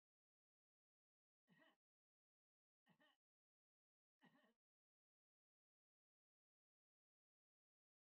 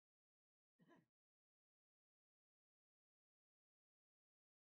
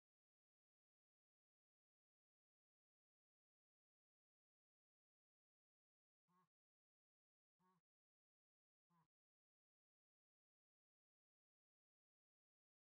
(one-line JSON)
{"three_cough_length": "8.1 s", "three_cough_amplitude": 31, "three_cough_signal_mean_std_ratio": 0.23, "cough_length": "4.6 s", "cough_amplitude": 40, "cough_signal_mean_std_ratio": 0.17, "exhalation_length": "12.8 s", "exhalation_amplitude": 7, "exhalation_signal_mean_std_ratio": 0.15, "survey_phase": "beta (2021-08-13 to 2022-03-07)", "age": "65+", "gender": "Male", "wearing_mask": "No", "symptom_none": true, "smoker_status": "Never smoked", "respiratory_condition_asthma": false, "respiratory_condition_other": false, "recruitment_source": "REACT", "submission_delay": "5 days", "covid_test_result": "Negative", "covid_test_method": "RT-qPCR", "influenza_a_test_result": "Negative", "influenza_b_test_result": "Negative"}